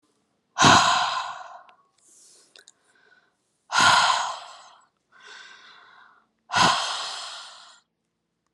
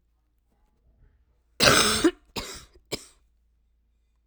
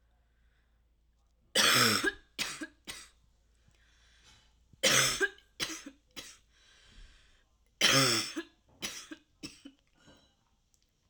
{"exhalation_length": "8.5 s", "exhalation_amplitude": 27081, "exhalation_signal_mean_std_ratio": 0.38, "cough_length": "4.3 s", "cough_amplitude": 24318, "cough_signal_mean_std_ratio": 0.3, "three_cough_length": "11.1 s", "three_cough_amplitude": 12777, "three_cough_signal_mean_std_ratio": 0.35, "survey_phase": "alpha (2021-03-01 to 2021-08-12)", "age": "18-44", "gender": "Female", "wearing_mask": "No", "symptom_cough_any": true, "symptom_shortness_of_breath": true, "symptom_fatigue": true, "symptom_fever_high_temperature": true, "symptom_headache": true, "symptom_change_to_sense_of_smell_or_taste": true, "symptom_loss_of_taste": true, "symptom_onset": "4 days", "smoker_status": "Never smoked", "respiratory_condition_asthma": false, "respiratory_condition_other": false, "recruitment_source": "Test and Trace", "submission_delay": "3 days", "covid_test_result": "Positive", "covid_test_method": "RT-qPCR", "covid_ct_value": 19.6, "covid_ct_gene": "ORF1ab gene", "covid_ct_mean": 20.4, "covid_viral_load": "200000 copies/ml", "covid_viral_load_category": "Low viral load (10K-1M copies/ml)"}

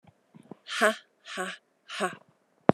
{"exhalation_length": "2.7 s", "exhalation_amplitude": 29317, "exhalation_signal_mean_std_ratio": 0.28, "survey_phase": "beta (2021-08-13 to 2022-03-07)", "age": "45-64", "gender": "Female", "wearing_mask": "Yes", "symptom_cough_any": true, "symptom_runny_or_blocked_nose": true, "symptom_shortness_of_breath": true, "symptom_fatigue": true, "symptom_fever_high_temperature": true, "symptom_change_to_sense_of_smell_or_taste": true, "symptom_onset": "3 days", "smoker_status": "Never smoked", "respiratory_condition_asthma": false, "respiratory_condition_other": false, "recruitment_source": "Test and Trace", "submission_delay": "2 days", "covid_test_result": "Positive", "covid_test_method": "RT-qPCR"}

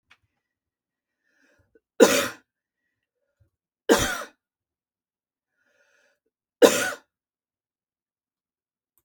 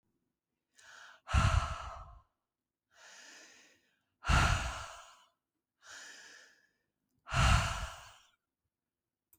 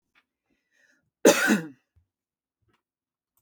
{"three_cough_length": "9.0 s", "three_cough_amplitude": 31832, "three_cough_signal_mean_std_ratio": 0.2, "exhalation_length": "9.4 s", "exhalation_amplitude": 6459, "exhalation_signal_mean_std_ratio": 0.34, "cough_length": "3.4 s", "cough_amplitude": 22167, "cough_signal_mean_std_ratio": 0.24, "survey_phase": "beta (2021-08-13 to 2022-03-07)", "age": "18-44", "gender": "Female", "wearing_mask": "No", "symptom_fatigue": true, "symptom_onset": "4 days", "smoker_status": "Ex-smoker", "respiratory_condition_asthma": false, "respiratory_condition_other": false, "recruitment_source": "REACT", "submission_delay": "3 days", "covid_test_result": "Negative", "covid_test_method": "RT-qPCR", "influenza_a_test_result": "Negative", "influenza_b_test_result": "Negative"}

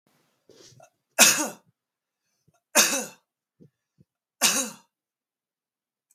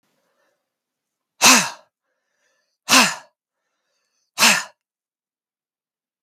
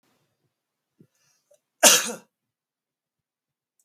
{"three_cough_length": "6.1 s", "three_cough_amplitude": 32768, "three_cough_signal_mean_std_ratio": 0.26, "exhalation_length": "6.2 s", "exhalation_amplitude": 32768, "exhalation_signal_mean_std_ratio": 0.26, "cough_length": "3.8 s", "cough_amplitude": 32767, "cough_signal_mean_std_ratio": 0.18, "survey_phase": "beta (2021-08-13 to 2022-03-07)", "age": "45-64", "gender": "Male", "wearing_mask": "No", "symptom_none": true, "smoker_status": "Prefer not to say", "respiratory_condition_asthma": false, "respiratory_condition_other": false, "recruitment_source": "REACT", "submission_delay": "1 day", "covid_test_result": "Negative", "covid_test_method": "RT-qPCR", "influenza_a_test_result": "Unknown/Void", "influenza_b_test_result": "Unknown/Void"}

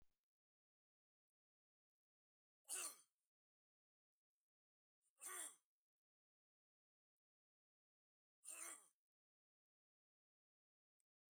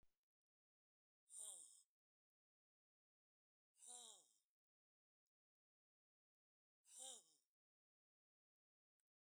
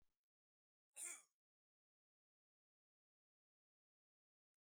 {"three_cough_length": "11.3 s", "three_cough_amplitude": 602, "three_cough_signal_mean_std_ratio": 0.21, "exhalation_length": "9.4 s", "exhalation_amplitude": 276, "exhalation_signal_mean_std_ratio": 0.27, "cough_length": "4.8 s", "cough_amplitude": 386, "cough_signal_mean_std_ratio": 0.17, "survey_phase": "beta (2021-08-13 to 2022-03-07)", "age": "65+", "gender": "Male", "wearing_mask": "No", "symptom_none": true, "smoker_status": "Never smoked", "respiratory_condition_asthma": false, "respiratory_condition_other": false, "recruitment_source": "REACT", "submission_delay": "2 days", "covid_test_result": "Negative", "covid_test_method": "RT-qPCR", "influenza_a_test_result": "Negative", "influenza_b_test_result": "Negative"}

